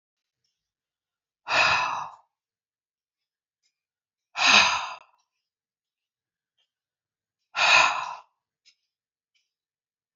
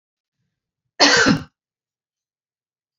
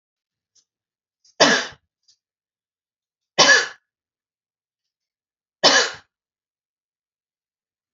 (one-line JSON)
{"exhalation_length": "10.2 s", "exhalation_amplitude": 20942, "exhalation_signal_mean_std_ratio": 0.29, "cough_length": "3.0 s", "cough_amplitude": 31235, "cough_signal_mean_std_ratio": 0.29, "three_cough_length": "7.9 s", "three_cough_amplitude": 32767, "three_cough_signal_mean_std_ratio": 0.24, "survey_phase": "beta (2021-08-13 to 2022-03-07)", "age": "45-64", "gender": "Female", "wearing_mask": "No", "symptom_none": true, "smoker_status": "Never smoked", "respiratory_condition_asthma": false, "respiratory_condition_other": false, "recruitment_source": "REACT", "submission_delay": "2 days", "covid_test_result": "Negative", "covid_test_method": "RT-qPCR", "influenza_a_test_result": "Negative", "influenza_b_test_result": "Negative"}